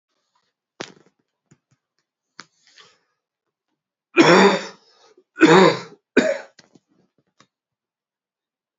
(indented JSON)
{
  "three_cough_length": "8.8 s",
  "three_cough_amplitude": 30529,
  "three_cough_signal_mean_std_ratio": 0.26,
  "survey_phase": "beta (2021-08-13 to 2022-03-07)",
  "age": "45-64",
  "gender": "Male",
  "wearing_mask": "No",
  "symptom_cough_any": true,
  "symptom_runny_or_blocked_nose": true,
  "symptom_sore_throat": true,
  "symptom_abdominal_pain": true,
  "symptom_fatigue": true,
  "symptom_fever_high_temperature": true,
  "symptom_headache": true,
  "symptom_change_to_sense_of_smell_or_taste": true,
  "symptom_onset": "6 days",
  "smoker_status": "Never smoked",
  "recruitment_source": "Test and Trace",
  "submission_delay": "2 days",
  "covid_test_result": "Positive",
  "covid_test_method": "RT-qPCR",
  "covid_ct_value": 16.1,
  "covid_ct_gene": "ORF1ab gene",
  "covid_ct_mean": 16.5,
  "covid_viral_load": "4000000 copies/ml",
  "covid_viral_load_category": "High viral load (>1M copies/ml)"
}